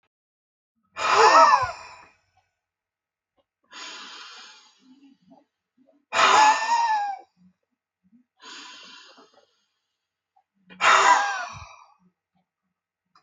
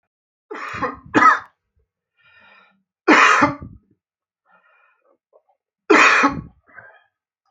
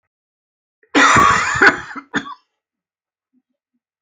{
  "exhalation_length": "13.2 s",
  "exhalation_amplitude": 22998,
  "exhalation_signal_mean_std_ratio": 0.34,
  "three_cough_length": "7.5 s",
  "three_cough_amplitude": 29893,
  "three_cough_signal_mean_std_ratio": 0.34,
  "cough_length": "4.0 s",
  "cough_amplitude": 32247,
  "cough_signal_mean_std_ratio": 0.38,
  "survey_phase": "beta (2021-08-13 to 2022-03-07)",
  "age": "65+",
  "gender": "Male",
  "wearing_mask": "No",
  "symptom_none": true,
  "smoker_status": "Never smoked",
  "respiratory_condition_asthma": true,
  "respiratory_condition_other": false,
  "recruitment_source": "REACT",
  "submission_delay": "3 days",
  "covid_test_result": "Negative",
  "covid_test_method": "RT-qPCR"
}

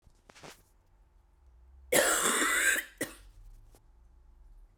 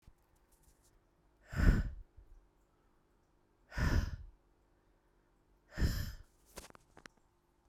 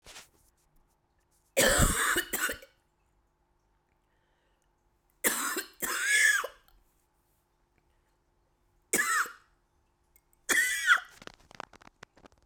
{
  "cough_length": "4.8 s",
  "cough_amplitude": 10450,
  "cough_signal_mean_std_ratio": 0.42,
  "exhalation_length": "7.7 s",
  "exhalation_amplitude": 7890,
  "exhalation_signal_mean_std_ratio": 0.31,
  "three_cough_length": "12.5 s",
  "three_cough_amplitude": 10009,
  "three_cough_signal_mean_std_ratio": 0.38,
  "survey_phase": "beta (2021-08-13 to 2022-03-07)",
  "age": "45-64",
  "gender": "Female",
  "wearing_mask": "No",
  "symptom_cough_any": true,
  "symptom_runny_or_blocked_nose": true,
  "symptom_abdominal_pain": true,
  "symptom_fatigue": true,
  "symptom_headache": true,
  "symptom_change_to_sense_of_smell_or_taste": true,
  "symptom_loss_of_taste": true,
  "symptom_onset": "5 days",
  "smoker_status": "Ex-smoker",
  "respiratory_condition_asthma": true,
  "respiratory_condition_other": false,
  "recruitment_source": "Test and Trace",
  "submission_delay": "2 days",
  "covid_test_result": "Positive",
  "covid_test_method": "RT-qPCR",
  "covid_ct_value": 19.7,
  "covid_ct_gene": "ORF1ab gene"
}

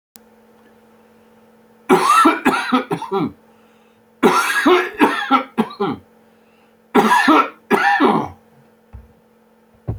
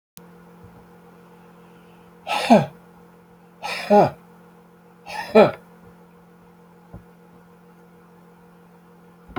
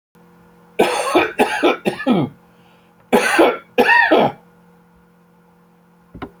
{
  "three_cough_length": "10.0 s",
  "three_cough_amplitude": 28465,
  "three_cough_signal_mean_std_ratio": 0.5,
  "exhalation_length": "9.4 s",
  "exhalation_amplitude": 27167,
  "exhalation_signal_mean_std_ratio": 0.27,
  "cough_length": "6.4 s",
  "cough_amplitude": 28301,
  "cough_signal_mean_std_ratio": 0.48,
  "survey_phase": "beta (2021-08-13 to 2022-03-07)",
  "age": "65+",
  "gender": "Male",
  "wearing_mask": "No",
  "symptom_none": true,
  "smoker_status": "Ex-smoker",
  "respiratory_condition_asthma": false,
  "respiratory_condition_other": false,
  "recruitment_source": "REACT",
  "submission_delay": "2 days",
  "covid_test_result": "Negative",
  "covid_test_method": "RT-qPCR"
}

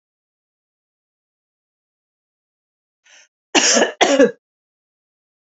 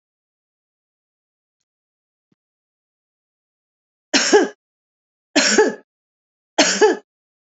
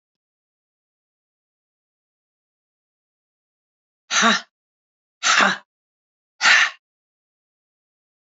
{
  "cough_length": "5.5 s",
  "cough_amplitude": 30653,
  "cough_signal_mean_std_ratio": 0.26,
  "three_cough_length": "7.6 s",
  "three_cough_amplitude": 32316,
  "three_cough_signal_mean_std_ratio": 0.28,
  "exhalation_length": "8.4 s",
  "exhalation_amplitude": 26591,
  "exhalation_signal_mean_std_ratio": 0.25,
  "survey_phase": "beta (2021-08-13 to 2022-03-07)",
  "age": "45-64",
  "gender": "Female",
  "wearing_mask": "No",
  "symptom_none": true,
  "smoker_status": "Ex-smoker",
  "respiratory_condition_asthma": false,
  "respiratory_condition_other": false,
  "recruitment_source": "REACT",
  "submission_delay": "2 days",
  "covid_test_result": "Negative",
  "covid_test_method": "RT-qPCR",
  "influenza_a_test_result": "Negative",
  "influenza_b_test_result": "Negative"
}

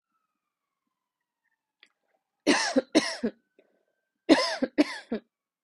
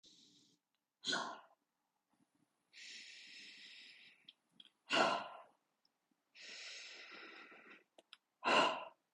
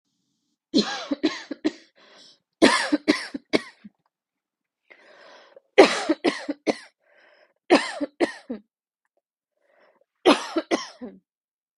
{
  "cough_length": "5.6 s",
  "cough_amplitude": 18450,
  "cough_signal_mean_std_ratio": 0.31,
  "exhalation_length": "9.1 s",
  "exhalation_amplitude": 3269,
  "exhalation_signal_mean_std_ratio": 0.33,
  "three_cough_length": "11.8 s",
  "three_cough_amplitude": 31421,
  "three_cough_signal_mean_std_ratio": 0.31,
  "survey_phase": "beta (2021-08-13 to 2022-03-07)",
  "age": "18-44",
  "gender": "Female",
  "wearing_mask": "No",
  "symptom_none": true,
  "smoker_status": "Never smoked",
  "respiratory_condition_asthma": false,
  "respiratory_condition_other": false,
  "recruitment_source": "REACT",
  "submission_delay": "5 days",
  "covid_test_result": "Negative",
  "covid_test_method": "RT-qPCR",
  "influenza_a_test_result": "Unknown/Void",
  "influenza_b_test_result": "Unknown/Void"
}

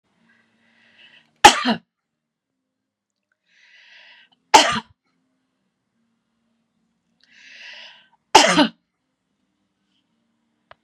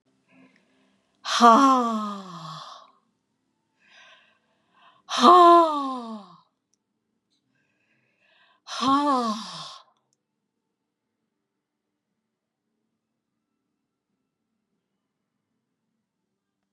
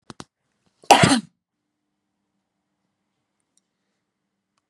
{
  "three_cough_length": "10.8 s",
  "three_cough_amplitude": 32768,
  "three_cough_signal_mean_std_ratio": 0.19,
  "exhalation_length": "16.7 s",
  "exhalation_amplitude": 27303,
  "exhalation_signal_mean_std_ratio": 0.27,
  "cough_length": "4.7 s",
  "cough_amplitude": 32767,
  "cough_signal_mean_std_ratio": 0.19,
  "survey_phase": "beta (2021-08-13 to 2022-03-07)",
  "age": "65+",
  "gender": "Female",
  "wearing_mask": "No",
  "symptom_none": true,
  "smoker_status": "Never smoked",
  "respiratory_condition_asthma": false,
  "respiratory_condition_other": false,
  "recruitment_source": "REACT",
  "submission_delay": "2 days",
  "covid_test_result": "Negative",
  "covid_test_method": "RT-qPCR",
  "influenza_a_test_result": "Negative",
  "influenza_b_test_result": "Negative"
}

